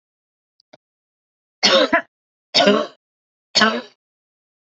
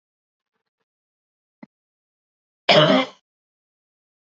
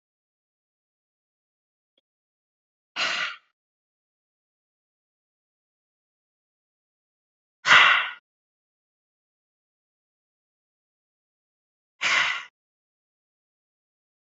{"three_cough_length": "4.8 s", "three_cough_amplitude": 30332, "three_cough_signal_mean_std_ratio": 0.34, "cough_length": "4.4 s", "cough_amplitude": 27746, "cough_signal_mean_std_ratio": 0.23, "exhalation_length": "14.3 s", "exhalation_amplitude": 25128, "exhalation_signal_mean_std_ratio": 0.19, "survey_phase": "beta (2021-08-13 to 2022-03-07)", "age": "45-64", "gender": "Female", "wearing_mask": "No", "symptom_shortness_of_breath": true, "symptom_onset": "13 days", "smoker_status": "Ex-smoker", "respiratory_condition_asthma": false, "respiratory_condition_other": false, "recruitment_source": "REACT", "submission_delay": "2 days", "covid_test_result": "Negative", "covid_test_method": "RT-qPCR", "influenza_a_test_result": "Negative", "influenza_b_test_result": "Negative"}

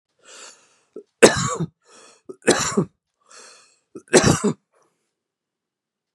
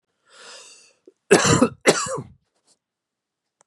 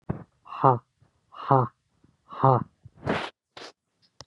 {"three_cough_length": "6.1 s", "three_cough_amplitude": 32768, "three_cough_signal_mean_std_ratio": 0.29, "cough_length": "3.7 s", "cough_amplitude": 31129, "cough_signal_mean_std_ratio": 0.32, "exhalation_length": "4.3 s", "exhalation_amplitude": 20635, "exhalation_signal_mean_std_ratio": 0.33, "survey_phase": "beta (2021-08-13 to 2022-03-07)", "age": "18-44", "gender": "Male", "wearing_mask": "No", "symptom_none": true, "smoker_status": "Never smoked", "respiratory_condition_asthma": false, "respiratory_condition_other": false, "recruitment_source": "REACT", "submission_delay": "1 day", "covid_test_result": "Negative", "covid_test_method": "RT-qPCR", "influenza_a_test_result": "Negative", "influenza_b_test_result": "Negative"}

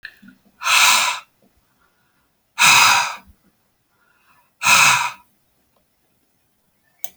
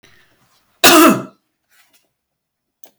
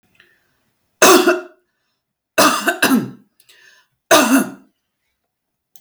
{"exhalation_length": "7.2 s", "exhalation_amplitude": 32767, "exhalation_signal_mean_std_ratio": 0.38, "cough_length": "3.0 s", "cough_amplitude": 32768, "cough_signal_mean_std_ratio": 0.3, "three_cough_length": "5.8 s", "three_cough_amplitude": 32768, "three_cough_signal_mean_std_ratio": 0.38, "survey_phase": "alpha (2021-03-01 to 2021-08-12)", "age": "45-64", "gender": "Female", "wearing_mask": "No", "symptom_none": true, "smoker_status": "Never smoked", "respiratory_condition_asthma": false, "respiratory_condition_other": false, "recruitment_source": "Test and Trace", "submission_delay": "1 day", "covid_test_result": "Positive", "covid_test_method": "RT-qPCR", "covid_ct_value": 34.3, "covid_ct_gene": "ORF1ab gene"}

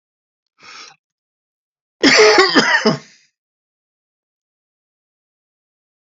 {"cough_length": "6.1 s", "cough_amplitude": 32636, "cough_signal_mean_std_ratio": 0.31, "survey_phase": "beta (2021-08-13 to 2022-03-07)", "age": "65+", "gender": "Male", "wearing_mask": "No", "symptom_none": true, "smoker_status": "Ex-smoker", "respiratory_condition_asthma": false, "respiratory_condition_other": false, "recruitment_source": "REACT", "submission_delay": "4 days", "covid_test_result": "Negative", "covid_test_method": "RT-qPCR", "influenza_a_test_result": "Negative", "influenza_b_test_result": "Negative"}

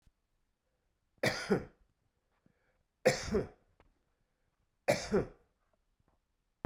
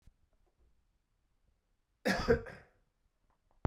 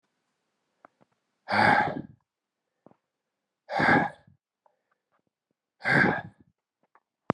{"three_cough_length": "6.7 s", "three_cough_amplitude": 6656, "three_cough_signal_mean_std_ratio": 0.29, "cough_length": "3.7 s", "cough_amplitude": 5834, "cough_signal_mean_std_ratio": 0.25, "exhalation_length": "7.3 s", "exhalation_amplitude": 16065, "exhalation_signal_mean_std_ratio": 0.32, "survey_phase": "beta (2021-08-13 to 2022-03-07)", "age": "18-44", "gender": "Male", "wearing_mask": "No", "symptom_cough_any": true, "symptom_runny_or_blocked_nose": true, "symptom_fatigue": true, "symptom_headache": true, "smoker_status": "Never smoked", "respiratory_condition_asthma": false, "respiratory_condition_other": false, "recruitment_source": "Test and Trace", "submission_delay": "2 days", "covid_test_result": "Positive", "covid_test_method": "RT-qPCR", "covid_ct_value": 17.4, "covid_ct_gene": "ORF1ab gene", "covid_ct_mean": 17.9, "covid_viral_load": "1300000 copies/ml", "covid_viral_load_category": "High viral load (>1M copies/ml)"}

